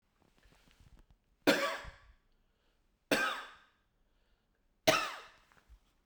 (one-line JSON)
{"three_cough_length": "6.1 s", "three_cough_amplitude": 8078, "three_cough_signal_mean_std_ratio": 0.29, "survey_phase": "beta (2021-08-13 to 2022-03-07)", "age": "65+", "gender": "Male", "wearing_mask": "No", "symptom_none": true, "smoker_status": "Ex-smoker", "respiratory_condition_asthma": false, "respiratory_condition_other": false, "recruitment_source": "REACT", "submission_delay": "2 days", "covid_test_result": "Negative", "covid_test_method": "RT-qPCR"}